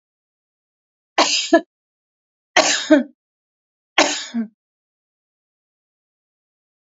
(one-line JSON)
{"three_cough_length": "6.9 s", "three_cough_amplitude": 29786, "three_cough_signal_mean_std_ratio": 0.29, "survey_phase": "alpha (2021-03-01 to 2021-08-12)", "age": "45-64", "gender": "Female", "wearing_mask": "No", "symptom_none": true, "smoker_status": "Ex-smoker", "respiratory_condition_asthma": false, "respiratory_condition_other": false, "recruitment_source": "REACT", "submission_delay": "2 days", "covid_test_result": "Negative", "covid_test_method": "RT-qPCR"}